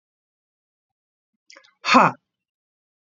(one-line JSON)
{"exhalation_length": "3.1 s", "exhalation_amplitude": 27749, "exhalation_signal_mean_std_ratio": 0.21, "survey_phase": "beta (2021-08-13 to 2022-03-07)", "age": "45-64", "gender": "Female", "wearing_mask": "No", "symptom_cough_any": true, "symptom_runny_or_blocked_nose": true, "symptom_headache": true, "symptom_change_to_sense_of_smell_or_taste": true, "symptom_loss_of_taste": true, "symptom_other": true, "smoker_status": "Ex-smoker", "respiratory_condition_asthma": false, "respiratory_condition_other": false, "recruitment_source": "Test and Trace", "submission_delay": "2 days", "covid_test_result": "Positive", "covid_test_method": "RT-qPCR"}